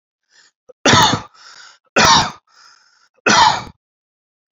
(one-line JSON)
{"three_cough_length": "4.5 s", "three_cough_amplitude": 31785, "three_cough_signal_mean_std_ratio": 0.4, "survey_phase": "beta (2021-08-13 to 2022-03-07)", "age": "45-64", "gender": "Male", "wearing_mask": "No", "symptom_none": true, "smoker_status": "Never smoked", "respiratory_condition_asthma": false, "respiratory_condition_other": false, "recruitment_source": "REACT", "submission_delay": "2 days", "covid_test_result": "Negative", "covid_test_method": "RT-qPCR", "influenza_a_test_result": "Negative", "influenza_b_test_result": "Negative"}